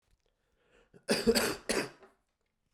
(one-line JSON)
{"cough_length": "2.7 s", "cough_amplitude": 8244, "cough_signal_mean_std_ratio": 0.37, "survey_phase": "beta (2021-08-13 to 2022-03-07)", "age": "18-44", "gender": "Male", "wearing_mask": "No", "symptom_cough_any": true, "symptom_runny_or_blocked_nose": true, "symptom_sore_throat": true, "symptom_abdominal_pain": true, "symptom_fever_high_temperature": true, "symptom_headache": true, "symptom_other": true, "symptom_onset": "2 days", "smoker_status": "Ex-smoker", "respiratory_condition_asthma": false, "respiratory_condition_other": false, "recruitment_source": "Test and Trace", "submission_delay": "1 day", "covid_test_result": "Positive", "covid_test_method": "ePCR"}